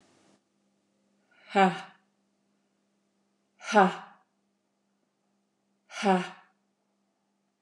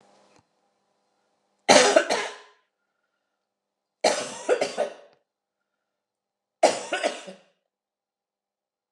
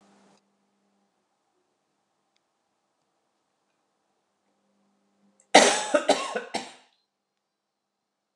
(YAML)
exhalation_length: 7.6 s
exhalation_amplitude: 13693
exhalation_signal_mean_std_ratio: 0.23
three_cough_length: 8.9 s
three_cough_amplitude: 29180
three_cough_signal_mean_std_ratio: 0.29
cough_length: 8.4 s
cough_amplitude: 29088
cough_signal_mean_std_ratio: 0.2
survey_phase: beta (2021-08-13 to 2022-03-07)
age: 45-64
gender: Female
wearing_mask: 'No'
symptom_cough_any: true
smoker_status: Never smoked
respiratory_condition_asthma: false
respiratory_condition_other: false
recruitment_source: REACT
submission_delay: 2 days
covid_test_result: Negative
covid_test_method: RT-qPCR